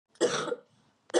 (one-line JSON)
{"three_cough_length": "1.2 s", "three_cough_amplitude": 9437, "three_cough_signal_mean_std_ratio": 0.45, "survey_phase": "beta (2021-08-13 to 2022-03-07)", "age": "18-44", "gender": "Female", "wearing_mask": "No", "symptom_cough_any": true, "symptom_fever_high_temperature": true, "symptom_headache": true, "smoker_status": "Never smoked", "respiratory_condition_asthma": false, "respiratory_condition_other": false, "recruitment_source": "Test and Trace", "submission_delay": "1 day", "covid_test_result": "Positive", "covid_test_method": "RT-qPCR"}